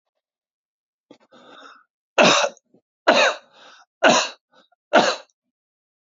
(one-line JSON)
{"cough_length": "6.1 s", "cough_amplitude": 26293, "cough_signal_mean_std_ratio": 0.33, "survey_phase": "beta (2021-08-13 to 2022-03-07)", "age": "65+", "gender": "Male", "wearing_mask": "No", "symptom_none": true, "smoker_status": "Ex-smoker", "respiratory_condition_asthma": false, "respiratory_condition_other": false, "recruitment_source": "REACT", "submission_delay": "1 day", "covid_test_result": "Negative", "covid_test_method": "RT-qPCR", "influenza_a_test_result": "Negative", "influenza_b_test_result": "Negative"}